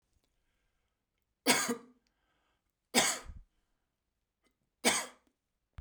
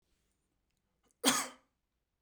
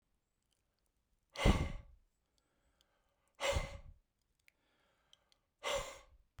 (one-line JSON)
{"three_cough_length": "5.8 s", "three_cough_amplitude": 10476, "three_cough_signal_mean_std_ratio": 0.27, "cough_length": "2.2 s", "cough_amplitude": 8311, "cough_signal_mean_std_ratio": 0.24, "exhalation_length": "6.4 s", "exhalation_amplitude": 5387, "exhalation_signal_mean_std_ratio": 0.28, "survey_phase": "beta (2021-08-13 to 2022-03-07)", "age": "45-64", "gender": "Male", "wearing_mask": "No", "symptom_none": true, "smoker_status": "Never smoked", "respiratory_condition_asthma": false, "respiratory_condition_other": false, "recruitment_source": "REACT", "submission_delay": "1 day", "covid_test_result": "Negative", "covid_test_method": "RT-qPCR"}